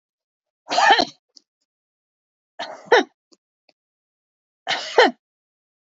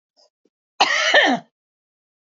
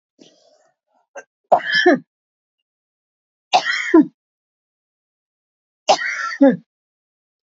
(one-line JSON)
{"exhalation_length": "5.8 s", "exhalation_amplitude": 27906, "exhalation_signal_mean_std_ratio": 0.27, "cough_length": "2.3 s", "cough_amplitude": 26998, "cough_signal_mean_std_ratio": 0.39, "three_cough_length": "7.4 s", "three_cough_amplitude": 27354, "three_cough_signal_mean_std_ratio": 0.31, "survey_phase": "beta (2021-08-13 to 2022-03-07)", "age": "45-64", "gender": "Female", "wearing_mask": "No", "symptom_none": true, "smoker_status": "Never smoked", "respiratory_condition_asthma": false, "respiratory_condition_other": false, "recruitment_source": "Test and Trace", "submission_delay": "2 days", "covid_test_result": "Negative", "covid_test_method": "RT-qPCR"}